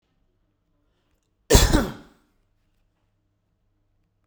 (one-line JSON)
{"cough_length": "4.3 s", "cough_amplitude": 32768, "cough_signal_mean_std_ratio": 0.22, "survey_phase": "beta (2021-08-13 to 2022-03-07)", "age": "45-64", "gender": "Male", "wearing_mask": "No", "symptom_none": true, "smoker_status": "Ex-smoker", "respiratory_condition_asthma": true, "respiratory_condition_other": false, "recruitment_source": "REACT", "submission_delay": "1 day", "covid_test_result": "Negative", "covid_test_method": "RT-qPCR"}